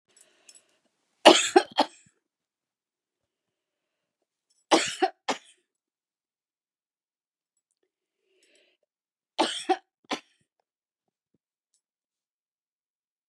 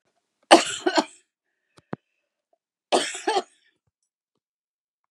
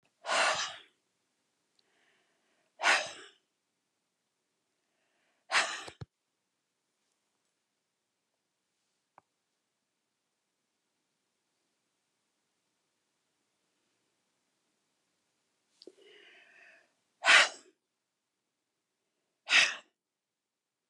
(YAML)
three_cough_length: 13.3 s
three_cough_amplitude: 32385
three_cough_signal_mean_std_ratio: 0.17
cough_length: 5.1 s
cough_amplitude: 32746
cough_signal_mean_std_ratio: 0.24
exhalation_length: 20.9 s
exhalation_amplitude: 12898
exhalation_signal_mean_std_ratio: 0.19
survey_phase: beta (2021-08-13 to 2022-03-07)
age: 65+
gender: Female
wearing_mask: 'No'
symptom_headache: true
symptom_onset: 12 days
smoker_status: Never smoked
respiratory_condition_asthma: false
respiratory_condition_other: false
recruitment_source: REACT
submission_delay: 2 days
covid_test_result: Negative
covid_test_method: RT-qPCR
influenza_a_test_result: Negative
influenza_b_test_result: Negative